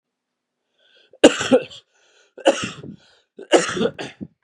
three_cough_length: 4.4 s
three_cough_amplitude: 32768
three_cough_signal_mean_std_ratio: 0.31
survey_phase: beta (2021-08-13 to 2022-03-07)
age: 18-44
gender: Male
wearing_mask: 'No'
symptom_cough_any: true
symptom_runny_or_blocked_nose: true
symptom_shortness_of_breath: true
symptom_fatigue: true
symptom_change_to_sense_of_smell_or_taste: true
symptom_loss_of_taste: true
symptom_onset: 5 days
smoker_status: Ex-smoker
respiratory_condition_asthma: false
respiratory_condition_other: false
recruitment_source: Test and Trace
submission_delay: 2 days
covid_test_result: Positive
covid_test_method: RT-qPCR
covid_ct_value: 22.4
covid_ct_gene: ORF1ab gene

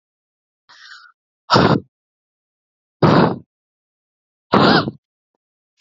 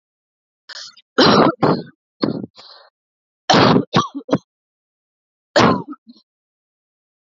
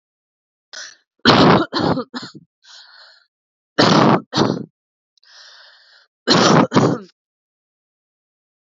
exhalation_length: 5.8 s
exhalation_amplitude: 32767
exhalation_signal_mean_std_ratio: 0.33
three_cough_length: 7.3 s
three_cough_amplitude: 32452
three_cough_signal_mean_std_ratio: 0.36
cough_length: 8.7 s
cough_amplitude: 32767
cough_signal_mean_std_ratio: 0.39
survey_phase: alpha (2021-03-01 to 2021-08-12)
age: 18-44
gender: Female
wearing_mask: 'No'
symptom_cough_any: true
symptom_new_continuous_cough: true
symptom_diarrhoea: true
symptom_headache: true
symptom_onset: 4 days
smoker_status: Current smoker (1 to 10 cigarettes per day)
respiratory_condition_asthma: false
respiratory_condition_other: false
recruitment_source: Test and Trace
submission_delay: 2 days
covid_test_result: Positive
covid_test_method: RT-qPCR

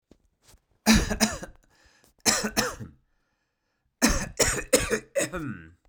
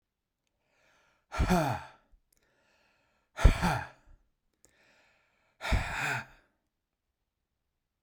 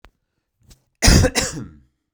three_cough_length: 5.9 s
three_cough_amplitude: 21316
three_cough_signal_mean_std_ratio: 0.44
exhalation_length: 8.0 s
exhalation_amplitude: 16501
exhalation_signal_mean_std_ratio: 0.29
cough_length: 2.1 s
cough_amplitude: 32767
cough_signal_mean_std_ratio: 0.36
survey_phase: beta (2021-08-13 to 2022-03-07)
age: 45-64
gender: Male
wearing_mask: 'No'
symptom_cough_any: true
symptom_new_continuous_cough: true
symptom_runny_or_blocked_nose: true
symptom_abdominal_pain: true
symptom_headache: true
symptom_change_to_sense_of_smell_or_taste: true
symptom_loss_of_taste: true
smoker_status: Never smoked
respiratory_condition_asthma: true
respiratory_condition_other: false
recruitment_source: Test and Trace
submission_delay: 2 days
covid_test_result: Positive
covid_test_method: RT-qPCR
covid_ct_value: 27.5
covid_ct_gene: ORF1ab gene
covid_ct_mean: 28.1
covid_viral_load: 590 copies/ml
covid_viral_load_category: Minimal viral load (< 10K copies/ml)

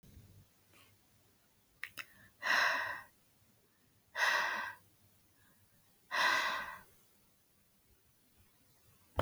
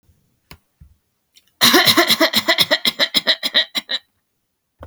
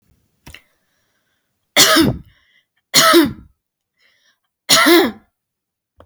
exhalation_length: 9.2 s
exhalation_amplitude: 5359
exhalation_signal_mean_std_ratio: 0.38
cough_length: 4.9 s
cough_amplitude: 32768
cough_signal_mean_std_ratio: 0.43
three_cough_length: 6.1 s
three_cough_amplitude: 32768
three_cough_signal_mean_std_ratio: 0.37
survey_phase: alpha (2021-03-01 to 2021-08-12)
age: 18-44
gender: Female
wearing_mask: 'No'
symptom_none: true
smoker_status: Never smoked
respiratory_condition_asthma: false
respiratory_condition_other: false
recruitment_source: REACT
submission_delay: 3 days
covid_test_result: Negative
covid_test_method: RT-qPCR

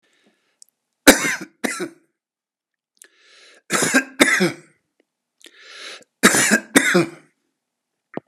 three_cough_length: 8.3 s
three_cough_amplitude: 32768
three_cough_signal_mean_std_ratio: 0.34
survey_phase: beta (2021-08-13 to 2022-03-07)
age: 65+
gender: Male
wearing_mask: 'No'
symptom_none: true
smoker_status: Ex-smoker
respiratory_condition_asthma: false
respiratory_condition_other: false
recruitment_source: REACT
submission_delay: 1 day
covid_test_result: Negative
covid_test_method: RT-qPCR
influenza_a_test_result: Negative
influenza_b_test_result: Negative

